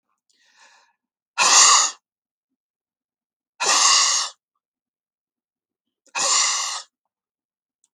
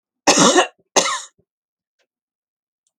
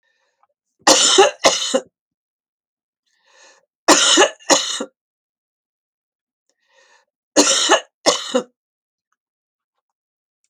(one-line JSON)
{"exhalation_length": "7.9 s", "exhalation_amplitude": 30462, "exhalation_signal_mean_std_ratio": 0.37, "cough_length": "3.0 s", "cough_amplitude": 32768, "cough_signal_mean_std_ratio": 0.34, "three_cough_length": "10.5 s", "three_cough_amplitude": 32768, "three_cough_signal_mean_std_ratio": 0.34, "survey_phase": "beta (2021-08-13 to 2022-03-07)", "age": "65+", "gender": "Female", "wearing_mask": "No", "symptom_none": true, "smoker_status": "Ex-smoker", "respiratory_condition_asthma": true, "respiratory_condition_other": false, "recruitment_source": "REACT", "submission_delay": "5 days", "covid_test_result": "Negative", "covid_test_method": "RT-qPCR", "influenza_a_test_result": "Negative", "influenza_b_test_result": "Negative"}